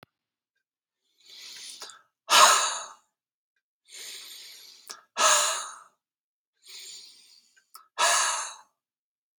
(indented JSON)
{
  "exhalation_length": "9.4 s",
  "exhalation_amplitude": 21300,
  "exhalation_signal_mean_std_ratio": 0.33,
  "survey_phase": "beta (2021-08-13 to 2022-03-07)",
  "age": "18-44",
  "gender": "Male",
  "wearing_mask": "No",
  "symptom_none": true,
  "smoker_status": "Ex-smoker",
  "respiratory_condition_asthma": true,
  "respiratory_condition_other": false,
  "recruitment_source": "REACT",
  "submission_delay": "1 day",
  "covid_test_result": "Negative",
  "covid_test_method": "RT-qPCR",
  "influenza_a_test_result": "Negative",
  "influenza_b_test_result": "Negative"
}